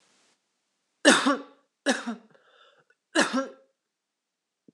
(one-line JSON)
{"three_cough_length": "4.7 s", "three_cough_amplitude": 20195, "three_cough_signal_mean_std_ratio": 0.3, "survey_phase": "beta (2021-08-13 to 2022-03-07)", "age": "45-64", "gender": "Female", "wearing_mask": "No", "symptom_cough_any": true, "symptom_runny_or_blocked_nose": true, "symptom_fatigue": true, "symptom_change_to_sense_of_smell_or_taste": true, "symptom_loss_of_taste": true, "symptom_other": true, "symptom_onset": "4 days", "smoker_status": "Ex-smoker", "respiratory_condition_asthma": false, "respiratory_condition_other": false, "recruitment_source": "Test and Trace", "submission_delay": "2 days", "covid_test_result": "Positive", "covid_test_method": "RT-qPCR"}